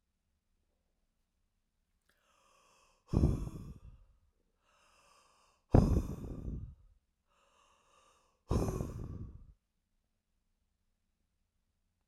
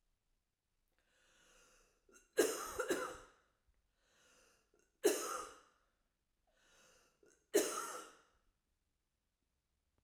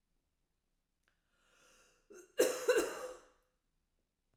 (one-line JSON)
{"exhalation_length": "12.1 s", "exhalation_amplitude": 9553, "exhalation_signal_mean_std_ratio": 0.26, "three_cough_length": "10.0 s", "three_cough_amplitude": 3530, "three_cough_signal_mean_std_ratio": 0.28, "cough_length": "4.4 s", "cough_amplitude": 4490, "cough_signal_mean_std_ratio": 0.28, "survey_phase": "beta (2021-08-13 to 2022-03-07)", "age": "45-64", "gender": "Female", "wearing_mask": "No", "symptom_change_to_sense_of_smell_or_taste": true, "symptom_onset": "12 days", "smoker_status": "Never smoked", "respiratory_condition_asthma": false, "respiratory_condition_other": false, "recruitment_source": "REACT", "submission_delay": "1 day", "covid_test_result": "Negative", "covid_test_method": "RT-qPCR", "influenza_a_test_result": "Negative", "influenza_b_test_result": "Negative"}